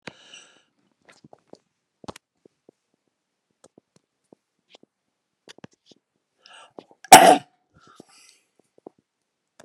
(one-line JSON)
{"cough_length": "9.6 s", "cough_amplitude": 32768, "cough_signal_mean_std_ratio": 0.13, "survey_phase": "beta (2021-08-13 to 2022-03-07)", "age": "65+", "gender": "Male", "wearing_mask": "No", "symptom_cough_any": true, "smoker_status": "Never smoked", "respiratory_condition_asthma": false, "respiratory_condition_other": false, "recruitment_source": "REACT", "submission_delay": "1 day", "covid_test_result": "Negative", "covid_test_method": "RT-qPCR"}